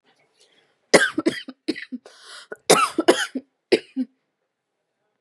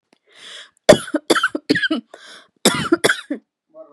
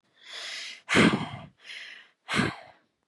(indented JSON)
{
  "three_cough_length": "5.2 s",
  "three_cough_amplitude": 32768,
  "three_cough_signal_mean_std_ratio": 0.31,
  "cough_length": "3.9 s",
  "cough_amplitude": 32768,
  "cough_signal_mean_std_ratio": 0.37,
  "exhalation_length": "3.1 s",
  "exhalation_amplitude": 14085,
  "exhalation_signal_mean_std_ratio": 0.41,
  "survey_phase": "beta (2021-08-13 to 2022-03-07)",
  "age": "18-44",
  "gender": "Female",
  "wearing_mask": "No",
  "symptom_cough_any": true,
  "symptom_headache": true,
  "symptom_onset": "12 days",
  "smoker_status": "Never smoked",
  "respiratory_condition_asthma": false,
  "respiratory_condition_other": false,
  "recruitment_source": "REACT",
  "submission_delay": "2 days",
  "covid_test_result": "Positive",
  "covid_test_method": "RT-qPCR",
  "covid_ct_value": 31.4,
  "covid_ct_gene": "E gene",
  "influenza_a_test_result": "Negative",
  "influenza_b_test_result": "Negative"
}